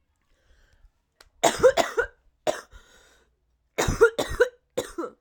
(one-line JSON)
{"three_cough_length": "5.2 s", "three_cough_amplitude": 18518, "three_cough_signal_mean_std_ratio": 0.34, "survey_phase": "alpha (2021-03-01 to 2021-08-12)", "age": "18-44", "gender": "Female", "wearing_mask": "No", "symptom_cough_any": true, "symptom_shortness_of_breath": true, "symptom_abdominal_pain": true, "symptom_fatigue": true, "symptom_fever_high_temperature": true, "symptom_headache": true, "symptom_change_to_sense_of_smell_or_taste": true, "symptom_loss_of_taste": true, "symptom_onset": "2 days", "smoker_status": "Current smoker (1 to 10 cigarettes per day)", "respiratory_condition_asthma": false, "respiratory_condition_other": false, "recruitment_source": "Test and Trace", "submission_delay": "1 day", "covid_test_result": "Positive", "covid_test_method": "RT-qPCR"}